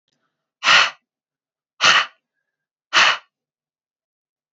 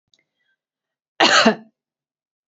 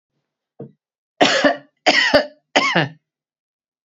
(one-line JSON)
{"exhalation_length": "4.5 s", "exhalation_amplitude": 31420, "exhalation_signal_mean_std_ratio": 0.31, "cough_length": "2.5 s", "cough_amplitude": 27746, "cough_signal_mean_std_ratio": 0.29, "three_cough_length": "3.8 s", "three_cough_amplitude": 32767, "three_cough_signal_mean_std_ratio": 0.41, "survey_phase": "beta (2021-08-13 to 2022-03-07)", "age": "45-64", "gender": "Female", "wearing_mask": "No", "symptom_none": true, "smoker_status": "Ex-smoker", "respiratory_condition_asthma": false, "respiratory_condition_other": false, "recruitment_source": "REACT", "submission_delay": "1 day", "covid_test_result": "Negative", "covid_test_method": "RT-qPCR"}